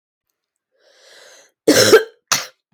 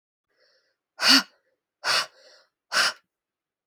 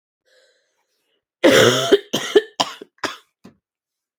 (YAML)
cough_length: 2.7 s
cough_amplitude: 32767
cough_signal_mean_std_ratio: 0.32
exhalation_length: 3.7 s
exhalation_amplitude: 21362
exhalation_signal_mean_std_ratio: 0.31
three_cough_length: 4.2 s
three_cough_amplitude: 30970
three_cough_signal_mean_std_ratio: 0.34
survey_phase: alpha (2021-03-01 to 2021-08-12)
age: 18-44
gender: Female
wearing_mask: 'No'
symptom_cough_any: true
symptom_onset: 12 days
smoker_status: Never smoked
respiratory_condition_asthma: false
respiratory_condition_other: false
recruitment_source: REACT
submission_delay: 2 days
covid_test_result: Negative
covid_test_method: RT-qPCR